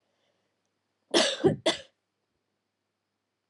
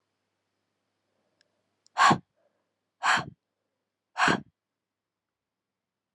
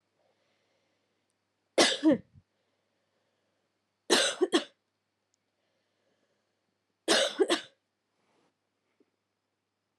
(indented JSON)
{
  "cough_length": "3.5 s",
  "cough_amplitude": 12013,
  "cough_signal_mean_std_ratio": 0.28,
  "exhalation_length": "6.1 s",
  "exhalation_amplitude": 13448,
  "exhalation_signal_mean_std_ratio": 0.24,
  "three_cough_length": "10.0 s",
  "three_cough_amplitude": 11866,
  "three_cough_signal_mean_std_ratio": 0.26,
  "survey_phase": "alpha (2021-03-01 to 2021-08-12)",
  "age": "18-44",
  "gender": "Female",
  "wearing_mask": "No",
  "symptom_fatigue": true,
  "smoker_status": "Never smoked",
  "respiratory_condition_asthma": false,
  "respiratory_condition_other": false,
  "recruitment_source": "Test and Trace",
  "submission_delay": "2 days",
  "covid_test_result": "Positive",
  "covid_test_method": "RT-qPCR",
  "covid_ct_value": 20.7,
  "covid_ct_gene": "ORF1ab gene",
  "covid_ct_mean": 20.9,
  "covid_viral_load": "140000 copies/ml",
  "covid_viral_load_category": "Low viral load (10K-1M copies/ml)"
}